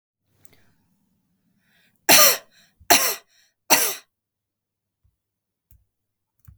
{"three_cough_length": "6.6 s", "three_cough_amplitude": 32768, "three_cough_signal_mean_std_ratio": 0.25, "survey_phase": "beta (2021-08-13 to 2022-03-07)", "age": "18-44", "gender": "Female", "wearing_mask": "No", "symptom_none": true, "smoker_status": "Current smoker (1 to 10 cigarettes per day)", "respiratory_condition_asthma": false, "respiratory_condition_other": false, "recruitment_source": "REACT", "submission_delay": "3 days", "covid_test_result": "Negative", "covid_test_method": "RT-qPCR", "influenza_a_test_result": "Negative", "influenza_b_test_result": "Negative"}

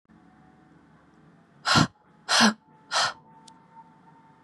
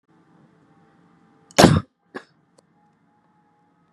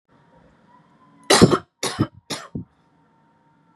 {"exhalation_length": "4.4 s", "exhalation_amplitude": 17144, "exhalation_signal_mean_std_ratio": 0.32, "cough_length": "3.9 s", "cough_amplitude": 32767, "cough_signal_mean_std_ratio": 0.18, "three_cough_length": "3.8 s", "three_cough_amplitude": 32208, "three_cough_signal_mean_std_ratio": 0.27, "survey_phase": "beta (2021-08-13 to 2022-03-07)", "age": "18-44", "gender": "Female", "wearing_mask": "No", "symptom_cough_any": true, "symptom_runny_or_blocked_nose": true, "symptom_sore_throat": true, "symptom_abdominal_pain": true, "symptom_fatigue": true, "symptom_headache": true, "smoker_status": "Never smoked", "respiratory_condition_asthma": false, "respiratory_condition_other": false, "recruitment_source": "Test and Trace", "submission_delay": "2 days", "covid_test_result": "Positive", "covid_test_method": "ePCR"}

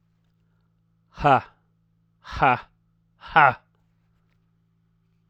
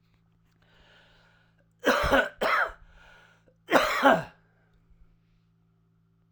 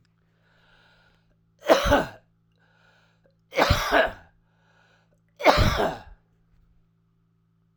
{"exhalation_length": "5.3 s", "exhalation_amplitude": 28993, "exhalation_signal_mean_std_ratio": 0.25, "cough_length": "6.3 s", "cough_amplitude": 20558, "cough_signal_mean_std_ratio": 0.35, "three_cough_length": "7.8 s", "three_cough_amplitude": 32767, "three_cough_signal_mean_std_ratio": 0.33, "survey_phase": "alpha (2021-03-01 to 2021-08-12)", "age": "45-64", "gender": "Male", "wearing_mask": "No", "symptom_cough_any": true, "symptom_shortness_of_breath": true, "symptom_fatigue": true, "symptom_fever_high_temperature": true, "symptom_headache": true, "symptom_onset": "3 days", "smoker_status": "Current smoker (e-cigarettes or vapes only)", "respiratory_condition_asthma": false, "respiratory_condition_other": false, "recruitment_source": "Test and Trace", "submission_delay": "1 day", "covid_test_result": "Positive", "covid_test_method": "RT-qPCR", "covid_ct_value": 12.1, "covid_ct_gene": "S gene", "covid_ct_mean": 12.6, "covid_viral_load": "72000000 copies/ml", "covid_viral_load_category": "High viral load (>1M copies/ml)"}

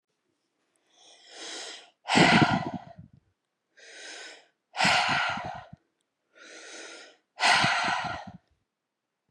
{"exhalation_length": "9.3 s", "exhalation_amplitude": 14913, "exhalation_signal_mean_std_ratio": 0.41, "survey_phase": "beta (2021-08-13 to 2022-03-07)", "age": "18-44", "gender": "Female", "wearing_mask": "No", "symptom_none": true, "smoker_status": "Never smoked", "respiratory_condition_asthma": false, "respiratory_condition_other": false, "recruitment_source": "REACT", "submission_delay": "1 day", "covid_test_result": "Negative", "covid_test_method": "RT-qPCR"}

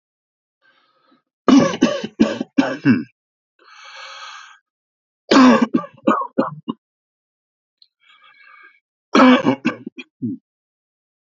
{"three_cough_length": "11.3 s", "three_cough_amplitude": 32245, "three_cough_signal_mean_std_ratio": 0.35, "survey_phase": "beta (2021-08-13 to 2022-03-07)", "age": "18-44", "gender": "Male", "wearing_mask": "No", "symptom_none": true, "smoker_status": "Never smoked", "respiratory_condition_asthma": true, "respiratory_condition_other": false, "recruitment_source": "REACT", "submission_delay": "2 days", "covid_test_result": "Negative", "covid_test_method": "RT-qPCR", "influenza_a_test_result": "Negative", "influenza_b_test_result": "Negative"}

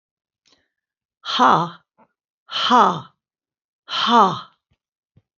{"exhalation_length": "5.4 s", "exhalation_amplitude": 27607, "exhalation_signal_mean_std_ratio": 0.36, "survey_phase": "beta (2021-08-13 to 2022-03-07)", "age": "65+", "gender": "Female", "wearing_mask": "No", "symptom_none": true, "smoker_status": "Never smoked", "respiratory_condition_asthma": false, "respiratory_condition_other": true, "recruitment_source": "REACT", "submission_delay": "2 days", "covid_test_result": "Negative", "covid_test_method": "RT-qPCR", "influenza_a_test_result": "Unknown/Void", "influenza_b_test_result": "Unknown/Void"}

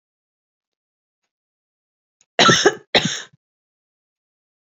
{"cough_length": "4.8 s", "cough_amplitude": 31014, "cough_signal_mean_std_ratio": 0.24, "survey_phase": "beta (2021-08-13 to 2022-03-07)", "age": "45-64", "gender": "Female", "wearing_mask": "No", "symptom_runny_or_blocked_nose": true, "symptom_onset": "6 days", "smoker_status": "Never smoked", "respiratory_condition_asthma": false, "respiratory_condition_other": false, "recruitment_source": "REACT", "submission_delay": "1 day", "covid_test_result": "Negative", "covid_test_method": "RT-qPCR", "influenza_a_test_result": "Negative", "influenza_b_test_result": "Negative"}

